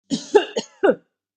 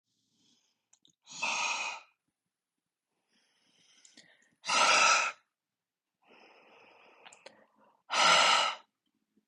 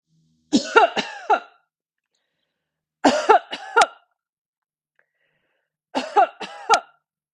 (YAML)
cough_length: 1.4 s
cough_amplitude: 26657
cough_signal_mean_std_ratio: 0.39
exhalation_length: 9.5 s
exhalation_amplitude: 9556
exhalation_signal_mean_std_ratio: 0.35
three_cough_length: 7.3 s
three_cough_amplitude: 32767
three_cough_signal_mean_std_ratio: 0.32
survey_phase: beta (2021-08-13 to 2022-03-07)
age: 45-64
gender: Female
wearing_mask: 'No'
symptom_fatigue: true
smoker_status: Never smoked
respiratory_condition_asthma: false
respiratory_condition_other: false
recruitment_source: REACT
submission_delay: 2 days
covid_test_result: Negative
covid_test_method: RT-qPCR
influenza_a_test_result: Negative
influenza_b_test_result: Negative